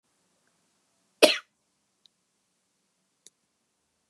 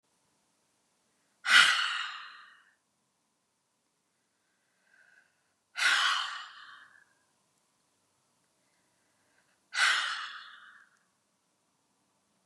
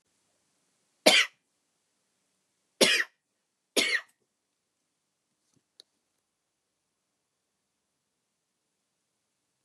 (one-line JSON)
{"cough_length": "4.1 s", "cough_amplitude": 28785, "cough_signal_mean_std_ratio": 0.13, "exhalation_length": "12.5 s", "exhalation_amplitude": 15005, "exhalation_signal_mean_std_ratio": 0.28, "three_cough_length": "9.6 s", "three_cough_amplitude": 22792, "three_cough_signal_mean_std_ratio": 0.19, "survey_phase": "beta (2021-08-13 to 2022-03-07)", "age": "45-64", "gender": "Female", "wearing_mask": "No", "symptom_none": true, "symptom_onset": "13 days", "smoker_status": "Ex-smoker", "respiratory_condition_asthma": false, "respiratory_condition_other": false, "recruitment_source": "REACT", "submission_delay": "8 days", "covid_test_result": "Negative", "covid_test_method": "RT-qPCR", "influenza_a_test_result": "Negative", "influenza_b_test_result": "Negative"}